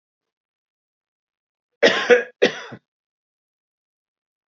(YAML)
cough_length: 4.5 s
cough_amplitude: 29055
cough_signal_mean_std_ratio: 0.24
survey_phase: beta (2021-08-13 to 2022-03-07)
age: 45-64
gender: Male
wearing_mask: 'No'
symptom_runny_or_blocked_nose: true
symptom_fatigue: true
smoker_status: Current smoker (1 to 10 cigarettes per day)
respiratory_condition_asthma: false
respiratory_condition_other: false
recruitment_source: REACT
submission_delay: 1 day
covid_test_result: Negative
covid_test_method: RT-qPCR
influenza_a_test_result: Negative
influenza_b_test_result: Negative